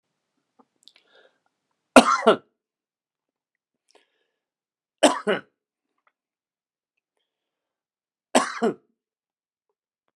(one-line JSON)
{"three_cough_length": "10.2 s", "three_cough_amplitude": 32768, "three_cough_signal_mean_std_ratio": 0.18, "survey_phase": "beta (2021-08-13 to 2022-03-07)", "age": "65+", "gender": "Male", "wearing_mask": "No", "symptom_cough_any": true, "symptom_runny_or_blocked_nose": true, "symptom_fatigue": true, "symptom_headache": true, "symptom_onset": "13 days", "smoker_status": "Ex-smoker", "respiratory_condition_asthma": false, "respiratory_condition_other": false, "recruitment_source": "REACT", "submission_delay": "1 day", "covid_test_result": "Negative", "covid_test_method": "RT-qPCR", "influenza_a_test_result": "Unknown/Void", "influenza_b_test_result": "Unknown/Void"}